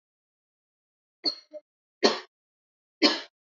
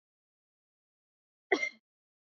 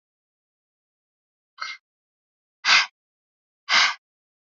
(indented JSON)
{
  "three_cough_length": "3.5 s",
  "three_cough_amplitude": 19970,
  "three_cough_signal_mean_std_ratio": 0.24,
  "cough_length": "2.4 s",
  "cough_amplitude": 7993,
  "cough_signal_mean_std_ratio": 0.18,
  "exhalation_length": "4.4 s",
  "exhalation_amplitude": 24947,
  "exhalation_signal_mean_std_ratio": 0.25,
  "survey_phase": "beta (2021-08-13 to 2022-03-07)",
  "age": "18-44",
  "gender": "Female",
  "wearing_mask": "No",
  "symptom_none": true,
  "smoker_status": "Never smoked",
  "recruitment_source": "REACT",
  "submission_delay": "1 day",
  "covid_test_result": "Negative",
  "covid_test_method": "RT-qPCR",
  "influenza_a_test_result": "Unknown/Void",
  "influenza_b_test_result": "Unknown/Void"
}